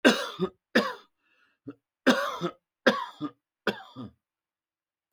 {"cough_length": "5.1 s", "cough_amplitude": 18706, "cough_signal_mean_std_ratio": 0.34, "survey_phase": "beta (2021-08-13 to 2022-03-07)", "age": "65+", "gender": "Male", "wearing_mask": "No", "symptom_none": true, "smoker_status": "Ex-smoker", "respiratory_condition_asthma": false, "respiratory_condition_other": false, "recruitment_source": "REACT", "submission_delay": "2 days", "covid_test_result": "Negative", "covid_test_method": "RT-qPCR"}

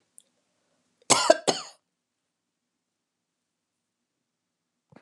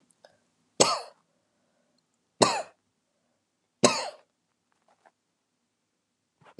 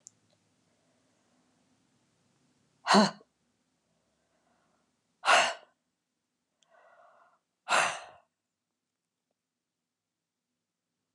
{"cough_length": "5.0 s", "cough_amplitude": 27147, "cough_signal_mean_std_ratio": 0.18, "three_cough_length": "6.6 s", "three_cough_amplitude": 29901, "three_cough_signal_mean_std_ratio": 0.21, "exhalation_length": "11.1 s", "exhalation_amplitude": 10500, "exhalation_signal_mean_std_ratio": 0.2, "survey_phase": "beta (2021-08-13 to 2022-03-07)", "age": "65+", "gender": "Female", "wearing_mask": "No", "symptom_runny_or_blocked_nose": true, "symptom_onset": "8 days", "smoker_status": "Never smoked", "respiratory_condition_asthma": false, "respiratory_condition_other": false, "recruitment_source": "REACT", "submission_delay": "2 days", "covid_test_result": "Positive", "covid_test_method": "RT-qPCR", "covid_ct_value": 21.0, "covid_ct_gene": "E gene", "influenza_a_test_result": "Negative", "influenza_b_test_result": "Negative"}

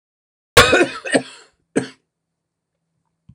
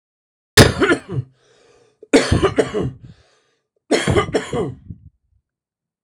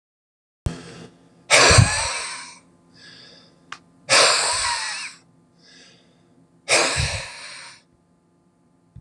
{"cough_length": "3.3 s", "cough_amplitude": 26028, "cough_signal_mean_std_ratio": 0.3, "three_cough_length": "6.0 s", "three_cough_amplitude": 26028, "three_cough_signal_mean_std_ratio": 0.4, "exhalation_length": "9.0 s", "exhalation_amplitude": 26020, "exhalation_signal_mean_std_ratio": 0.39, "survey_phase": "beta (2021-08-13 to 2022-03-07)", "age": "45-64", "gender": "Male", "wearing_mask": "No", "symptom_cough_any": true, "smoker_status": "Never smoked", "respiratory_condition_asthma": false, "respiratory_condition_other": false, "recruitment_source": "REACT", "submission_delay": "2 days", "covid_test_result": "Negative", "covid_test_method": "RT-qPCR", "influenza_a_test_result": "Negative", "influenza_b_test_result": "Negative"}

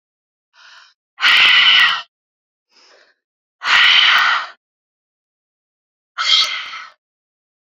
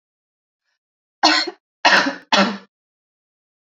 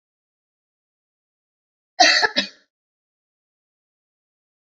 {"exhalation_length": "7.8 s", "exhalation_amplitude": 32767, "exhalation_signal_mean_std_ratio": 0.43, "three_cough_length": "3.8 s", "three_cough_amplitude": 30526, "three_cough_signal_mean_std_ratio": 0.35, "cough_length": "4.6 s", "cough_amplitude": 28902, "cough_signal_mean_std_ratio": 0.21, "survey_phase": "beta (2021-08-13 to 2022-03-07)", "age": "18-44", "gender": "Female", "wearing_mask": "No", "symptom_none": true, "symptom_onset": "4 days", "smoker_status": "Current smoker (11 or more cigarettes per day)", "respiratory_condition_asthma": false, "respiratory_condition_other": false, "recruitment_source": "REACT", "submission_delay": "3 days", "covid_test_result": "Negative", "covid_test_method": "RT-qPCR", "influenza_a_test_result": "Negative", "influenza_b_test_result": "Negative"}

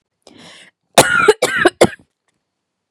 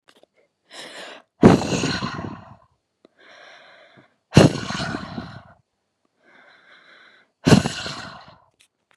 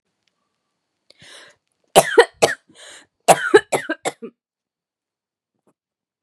{"cough_length": "2.9 s", "cough_amplitude": 32768, "cough_signal_mean_std_ratio": 0.35, "exhalation_length": "9.0 s", "exhalation_amplitude": 32768, "exhalation_signal_mean_std_ratio": 0.29, "three_cough_length": "6.2 s", "three_cough_amplitude": 32768, "three_cough_signal_mean_std_ratio": 0.24, "survey_phase": "beta (2021-08-13 to 2022-03-07)", "age": "18-44", "gender": "Female", "wearing_mask": "No", "symptom_cough_any": true, "symptom_runny_or_blocked_nose": true, "symptom_fatigue": true, "symptom_headache": true, "symptom_onset": "7 days", "smoker_status": "Never smoked", "respiratory_condition_asthma": false, "respiratory_condition_other": false, "recruitment_source": "Test and Trace", "submission_delay": "2 days", "covid_test_result": "Positive", "covid_test_method": "ePCR"}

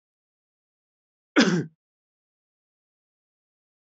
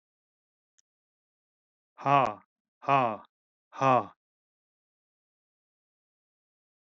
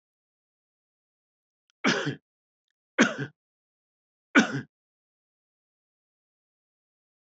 {"cough_length": "3.8 s", "cough_amplitude": 17952, "cough_signal_mean_std_ratio": 0.2, "exhalation_length": "6.8 s", "exhalation_amplitude": 12789, "exhalation_signal_mean_std_ratio": 0.23, "three_cough_length": "7.3 s", "three_cough_amplitude": 20824, "three_cough_signal_mean_std_ratio": 0.21, "survey_phase": "beta (2021-08-13 to 2022-03-07)", "age": "45-64", "gender": "Male", "wearing_mask": "No", "symptom_none": true, "symptom_onset": "12 days", "smoker_status": "Never smoked", "respiratory_condition_asthma": false, "respiratory_condition_other": false, "recruitment_source": "REACT", "submission_delay": "1 day", "covid_test_result": "Negative", "covid_test_method": "RT-qPCR"}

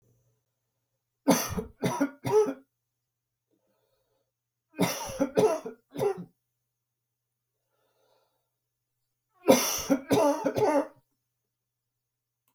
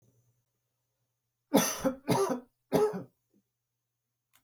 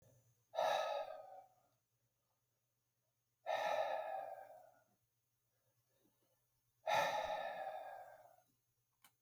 {"three_cough_length": "12.5 s", "three_cough_amplitude": 18325, "three_cough_signal_mean_std_ratio": 0.36, "cough_length": "4.4 s", "cough_amplitude": 10350, "cough_signal_mean_std_ratio": 0.35, "exhalation_length": "9.2 s", "exhalation_amplitude": 1992, "exhalation_signal_mean_std_ratio": 0.44, "survey_phase": "beta (2021-08-13 to 2022-03-07)", "age": "65+", "gender": "Male", "wearing_mask": "No", "symptom_none": true, "smoker_status": "Never smoked", "respiratory_condition_asthma": false, "respiratory_condition_other": false, "recruitment_source": "REACT", "submission_delay": "3 days", "covid_test_result": "Negative", "covid_test_method": "RT-qPCR"}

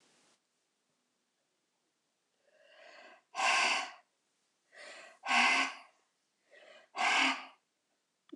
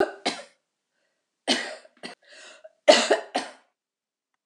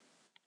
{"exhalation_length": "8.4 s", "exhalation_amplitude": 6360, "exhalation_signal_mean_std_ratio": 0.35, "three_cough_length": "4.5 s", "three_cough_amplitude": 25776, "three_cough_signal_mean_std_ratio": 0.29, "cough_length": "0.5 s", "cough_amplitude": 252, "cough_signal_mean_std_ratio": 0.78, "survey_phase": "beta (2021-08-13 to 2022-03-07)", "age": "65+", "gender": "Female", "wearing_mask": "No", "symptom_none": true, "smoker_status": "Never smoked", "respiratory_condition_asthma": false, "respiratory_condition_other": false, "recruitment_source": "REACT", "submission_delay": "2 days", "covid_test_result": "Negative", "covid_test_method": "RT-qPCR"}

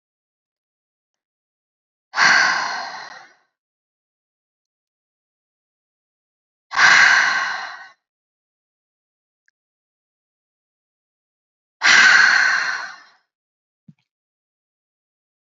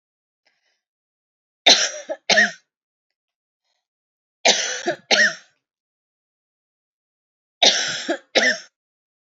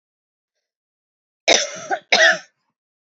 {"exhalation_length": "15.5 s", "exhalation_amplitude": 31008, "exhalation_signal_mean_std_ratio": 0.31, "three_cough_length": "9.3 s", "three_cough_amplitude": 32768, "three_cough_signal_mean_std_ratio": 0.32, "cough_length": "3.2 s", "cough_amplitude": 30180, "cough_signal_mean_std_ratio": 0.32, "survey_phase": "beta (2021-08-13 to 2022-03-07)", "age": "45-64", "gender": "Female", "wearing_mask": "No", "symptom_runny_or_blocked_nose": true, "symptom_other": true, "symptom_onset": "2 days", "smoker_status": "Ex-smoker", "respiratory_condition_asthma": false, "respiratory_condition_other": false, "recruitment_source": "Test and Trace", "submission_delay": "2 days", "covid_test_result": "Positive", "covid_test_method": "RT-qPCR", "covid_ct_value": 19.5, "covid_ct_gene": "ORF1ab gene", "covid_ct_mean": 20.1, "covid_viral_load": "260000 copies/ml", "covid_viral_load_category": "Low viral load (10K-1M copies/ml)"}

